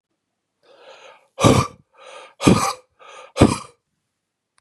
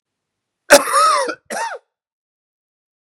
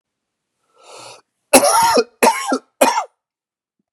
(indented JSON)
{
  "exhalation_length": "4.6 s",
  "exhalation_amplitude": 32768,
  "exhalation_signal_mean_std_ratio": 0.31,
  "cough_length": "3.2 s",
  "cough_amplitude": 32768,
  "cough_signal_mean_std_ratio": 0.35,
  "three_cough_length": "3.9 s",
  "three_cough_amplitude": 32768,
  "three_cough_signal_mean_std_ratio": 0.41,
  "survey_phase": "beta (2021-08-13 to 2022-03-07)",
  "age": "45-64",
  "gender": "Male",
  "wearing_mask": "No",
  "symptom_cough_any": true,
  "symptom_runny_or_blocked_nose": true,
  "symptom_sore_throat": true,
  "symptom_fatigue": true,
  "symptom_onset": "3 days",
  "smoker_status": "Ex-smoker",
  "respiratory_condition_asthma": false,
  "respiratory_condition_other": false,
  "recruitment_source": "Test and Trace",
  "submission_delay": "2 days",
  "covid_test_result": "Positive",
  "covid_test_method": "ePCR"
}